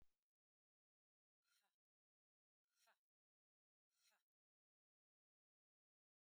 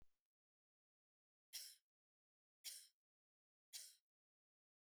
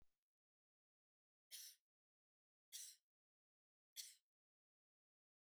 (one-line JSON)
{"exhalation_length": "6.3 s", "exhalation_amplitude": 21, "exhalation_signal_mean_std_ratio": 0.22, "cough_length": "4.9 s", "cough_amplitude": 367, "cough_signal_mean_std_ratio": 0.27, "three_cough_length": "5.5 s", "three_cough_amplitude": 513, "three_cough_signal_mean_std_ratio": 0.26, "survey_phase": "beta (2021-08-13 to 2022-03-07)", "age": "45-64", "gender": "Female", "wearing_mask": "No", "symptom_cough_any": true, "symptom_runny_or_blocked_nose": true, "symptom_headache": true, "symptom_other": true, "smoker_status": "Never smoked", "respiratory_condition_asthma": false, "respiratory_condition_other": false, "recruitment_source": "Test and Trace", "submission_delay": "1 day", "covid_test_result": "Positive", "covid_test_method": "ePCR"}